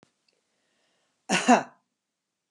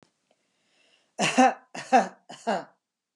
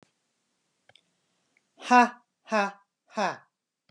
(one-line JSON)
{"cough_length": "2.5 s", "cough_amplitude": 19182, "cough_signal_mean_std_ratio": 0.24, "three_cough_length": "3.2 s", "three_cough_amplitude": 17642, "three_cough_signal_mean_std_ratio": 0.33, "exhalation_length": "3.9 s", "exhalation_amplitude": 20349, "exhalation_signal_mean_std_ratio": 0.25, "survey_phase": "beta (2021-08-13 to 2022-03-07)", "age": "65+", "gender": "Female", "wearing_mask": "No", "symptom_none": true, "smoker_status": "Ex-smoker", "respiratory_condition_asthma": false, "respiratory_condition_other": false, "recruitment_source": "REACT", "submission_delay": "1 day", "covid_test_result": "Negative", "covid_test_method": "RT-qPCR", "influenza_a_test_result": "Unknown/Void", "influenza_b_test_result": "Unknown/Void"}